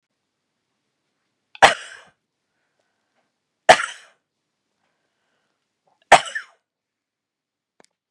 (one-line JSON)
{"three_cough_length": "8.1 s", "three_cough_amplitude": 32768, "three_cough_signal_mean_std_ratio": 0.15, "survey_phase": "beta (2021-08-13 to 2022-03-07)", "age": "45-64", "gender": "Female", "wearing_mask": "No", "symptom_fatigue": true, "symptom_onset": "2 days", "smoker_status": "Ex-smoker", "respiratory_condition_asthma": false, "respiratory_condition_other": false, "recruitment_source": "Test and Trace", "submission_delay": "1 day", "covid_test_result": "Negative", "covid_test_method": "RT-qPCR"}